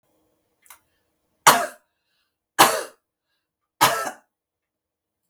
{"three_cough_length": "5.3 s", "three_cough_amplitude": 32768, "three_cough_signal_mean_std_ratio": 0.24, "survey_phase": "beta (2021-08-13 to 2022-03-07)", "age": "65+", "gender": "Female", "wearing_mask": "No", "symptom_none": true, "smoker_status": "Ex-smoker", "respiratory_condition_asthma": false, "respiratory_condition_other": false, "recruitment_source": "REACT", "submission_delay": "2 days", "covid_test_result": "Negative", "covid_test_method": "RT-qPCR", "influenza_a_test_result": "Negative", "influenza_b_test_result": "Negative"}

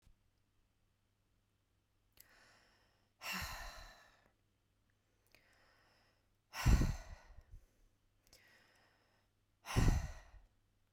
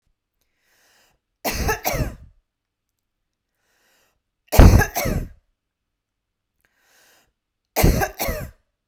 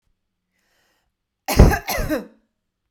{"exhalation_length": "10.9 s", "exhalation_amplitude": 4247, "exhalation_signal_mean_std_ratio": 0.26, "three_cough_length": "8.9 s", "three_cough_amplitude": 32768, "three_cough_signal_mean_std_ratio": 0.28, "cough_length": "2.9 s", "cough_amplitude": 32768, "cough_signal_mean_std_ratio": 0.29, "survey_phase": "beta (2021-08-13 to 2022-03-07)", "age": "18-44", "gender": "Female", "wearing_mask": "No", "symptom_none": true, "smoker_status": "Never smoked", "respiratory_condition_asthma": false, "respiratory_condition_other": false, "recruitment_source": "REACT", "submission_delay": "1 day", "covid_test_result": "Negative", "covid_test_method": "RT-qPCR", "influenza_a_test_result": "Negative", "influenza_b_test_result": "Negative"}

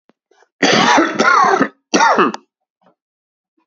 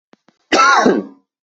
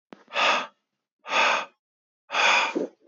{"three_cough_length": "3.7 s", "three_cough_amplitude": 29542, "three_cough_signal_mean_std_ratio": 0.54, "cough_length": "1.5 s", "cough_amplitude": 29850, "cough_signal_mean_std_ratio": 0.52, "exhalation_length": "3.1 s", "exhalation_amplitude": 12367, "exhalation_signal_mean_std_ratio": 0.53, "survey_phase": "beta (2021-08-13 to 2022-03-07)", "age": "18-44", "gender": "Male", "wearing_mask": "No", "symptom_cough_any": true, "symptom_runny_or_blocked_nose": true, "symptom_headache": true, "symptom_change_to_sense_of_smell_or_taste": true, "symptom_loss_of_taste": true, "smoker_status": "Never smoked", "respiratory_condition_asthma": false, "respiratory_condition_other": false, "recruitment_source": "Test and Trace", "submission_delay": "3 days", "covid_test_result": "Positive", "covid_test_method": "LFT"}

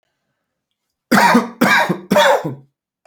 {"three_cough_length": "3.1 s", "three_cough_amplitude": 29974, "three_cough_signal_mean_std_ratio": 0.5, "survey_phase": "beta (2021-08-13 to 2022-03-07)", "age": "18-44", "gender": "Male", "wearing_mask": "No", "symptom_sore_throat": true, "symptom_onset": "2 days", "smoker_status": "Never smoked", "respiratory_condition_asthma": false, "respiratory_condition_other": false, "recruitment_source": "REACT", "submission_delay": "0 days", "covid_test_result": "Negative", "covid_test_method": "RT-qPCR"}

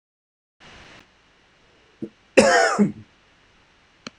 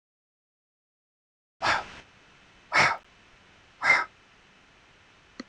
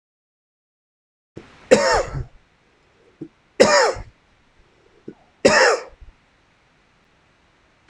{"cough_length": "4.2 s", "cough_amplitude": 26028, "cough_signal_mean_std_ratio": 0.3, "exhalation_length": "5.5 s", "exhalation_amplitude": 12825, "exhalation_signal_mean_std_ratio": 0.29, "three_cough_length": "7.9 s", "three_cough_amplitude": 26028, "three_cough_signal_mean_std_ratio": 0.3, "survey_phase": "beta (2021-08-13 to 2022-03-07)", "age": "18-44", "gender": "Male", "wearing_mask": "No", "symptom_cough_any": true, "symptom_runny_or_blocked_nose": true, "symptom_sore_throat": true, "symptom_abdominal_pain": true, "symptom_fatigue": true, "symptom_headache": true, "symptom_change_to_sense_of_smell_or_taste": true, "symptom_onset": "3 days", "smoker_status": "Never smoked", "respiratory_condition_asthma": false, "respiratory_condition_other": false, "recruitment_source": "Test and Trace", "submission_delay": "1 day", "covid_test_result": "Positive", "covid_test_method": "RT-qPCR", "covid_ct_value": 20.9, "covid_ct_gene": "ORF1ab gene"}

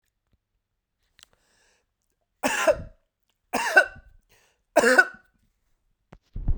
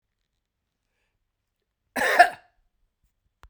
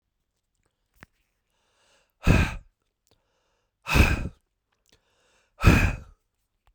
{"three_cough_length": "6.6 s", "three_cough_amplitude": 27690, "three_cough_signal_mean_std_ratio": 0.29, "cough_length": "3.5 s", "cough_amplitude": 30456, "cough_signal_mean_std_ratio": 0.2, "exhalation_length": "6.7 s", "exhalation_amplitude": 20849, "exhalation_signal_mean_std_ratio": 0.28, "survey_phase": "beta (2021-08-13 to 2022-03-07)", "age": "45-64", "gender": "Male", "wearing_mask": "No", "symptom_none": true, "symptom_onset": "5 days", "smoker_status": "Never smoked", "respiratory_condition_asthma": false, "respiratory_condition_other": false, "recruitment_source": "Test and Trace", "submission_delay": "2 days", "covid_test_result": "Positive", "covid_test_method": "RT-qPCR", "covid_ct_value": 33.0, "covid_ct_gene": "ORF1ab gene"}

